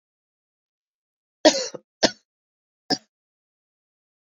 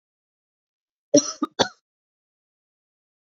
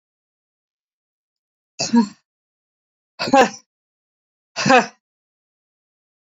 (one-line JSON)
{"three_cough_length": "4.3 s", "three_cough_amplitude": 32768, "three_cough_signal_mean_std_ratio": 0.18, "cough_length": "3.2 s", "cough_amplitude": 25519, "cough_signal_mean_std_ratio": 0.19, "exhalation_length": "6.2 s", "exhalation_amplitude": 28034, "exhalation_signal_mean_std_ratio": 0.25, "survey_phase": "beta (2021-08-13 to 2022-03-07)", "age": "45-64", "gender": "Female", "wearing_mask": "No", "symptom_cough_any": true, "symptom_new_continuous_cough": true, "symptom_runny_or_blocked_nose": true, "symptom_sore_throat": true, "symptom_fever_high_temperature": true, "symptom_change_to_sense_of_smell_or_taste": true, "symptom_onset": "3 days", "smoker_status": "Ex-smoker", "respiratory_condition_asthma": false, "respiratory_condition_other": false, "recruitment_source": "Test and Trace", "submission_delay": "1 day", "covid_test_result": "Positive", "covid_test_method": "RT-qPCR"}